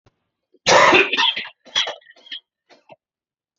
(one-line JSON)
{"cough_length": "3.6 s", "cough_amplitude": 28189, "cough_signal_mean_std_ratio": 0.38, "survey_phase": "beta (2021-08-13 to 2022-03-07)", "age": "45-64", "gender": "Male", "wearing_mask": "No", "symptom_none": true, "smoker_status": "Ex-smoker", "respiratory_condition_asthma": false, "respiratory_condition_other": false, "recruitment_source": "REACT", "submission_delay": "1 day", "covid_test_result": "Negative", "covid_test_method": "RT-qPCR"}